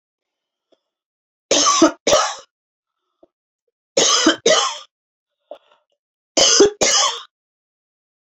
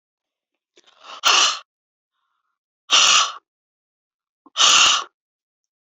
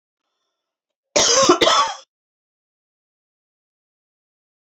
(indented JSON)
{
  "three_cough_length": "8.4 s",
  "three_cough_amplitude": 29457,
  "three_cough_signal_mean_std_ratio": 0.4,
  "exhalation_length": "5.8 s",
  "exhalation_amplitude": 28836,
  "exhalation_signal_mean_std_ratio": 0.37,
  "cough_length": "4.6 s",
  "cough_amplitude": 27601,
  "cough_signal_mean_std_ratio": 0.32,
  "survey_phase": "beta (2021-08-13 to 2022-03-07)",
  "age": "45-64",
  "gender": "Female",
  "wearing_mask": "No",
  "symptom_cough_any": true,
  "smoker_status": "Never smoked",
  "respiratory_condition_asthma": false,
  "respiratory_condition_other": false,
  "recruitment_source": "REACT",
  "submission_delay": "1 day",
  "covid_test_result": "Negative",
  "covid_test_method": "RT-qPCR",
  "influenza_a_test_result": "Negative",
  "influenza_b_test_result": "Negative"
}